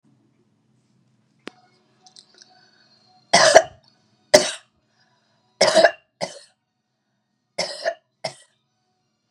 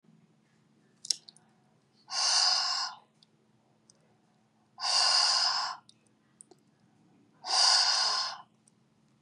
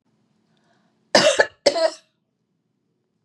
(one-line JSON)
{"three_cough_length": "9.3 s", "three_cough_amplitude": 32768, "three_cough_signal_mean_std_ratio": 0.24, "exhalation_length": "9.2 s", "exhalation_amplitude": 16710, "exhalation_signal_mean_std_ratio": 0.45, "cough_length": "3.2 s", "cough_amplitude": 31641, "cough_signal_mean_std_ratio": 0.3, "survey_phase": "beta (2021-08-13 to 2022-03-07)", "age": "65+", "gender": "Female", "wearing_mask": "No", "symptom_none": true, "smoker_status": "Never smoked", "respiratory_condition_asthma": false, "respiratory_condition_other": false, "recruitment_source": "REACT", "submission_delay": "2 days", "covid_test_result": "Negative", "covid_test_method": "RT-qPCR"}